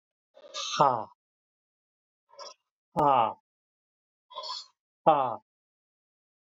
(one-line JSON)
{"exhalation_length": "6.5 s", "exhalation_amplitude": 16009, "exhalation_signal_mean_std_ratio": 0.3, "survey_phase": "alpha (2021-03-01 to 2021-08-12)", "age": "45-64", "gender": "Male", "wearing_mask": "No", "symptom_none": true, "smoker_status": "Never smoked", "respiratory_condition_asthma": false, "respiratory_condition_other": false, "recruitment_source": "REACT", "submission_delay": "6 days", "covid_test_result": "Negative", "covid_test_method": "RT-qPCR"}